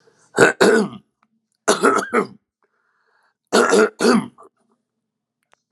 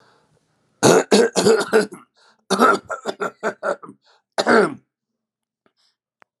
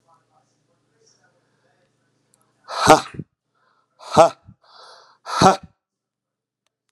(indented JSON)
{
  "three_cough_length": "5.7 s",
  "three_cough_amplitude": 32768,
  "three_cough_signal_mean_std_ratio": 0.41,
  "cough_length": "6.4 s",
  "cough_amplitude": 32767,
  "cough_signal_mean_std_ratio": 0.41,
  "exhalation_length": "6.9 s",
  "exhalation_amplitude": 32768,
  "exhalation_signal_mean_std_ratio": 0.22,
  "survey_phase": "alpha (2021-03-01 to 2021-08-12)",
  "age": "65+",
  "gender": "Male",
  "wearing_mask": "No",
  "symptom_none": true,
  "smoker_status": "Never smoked",
  "respiratory_condition_asthma": false,
  "respiratory_condition_other": false,
  "recruitment_source": "REACT",
  "submission_delay": "1 day",
  "covid_test_result": "Negative",
  "covid_test_method": "RT-qPCR"
}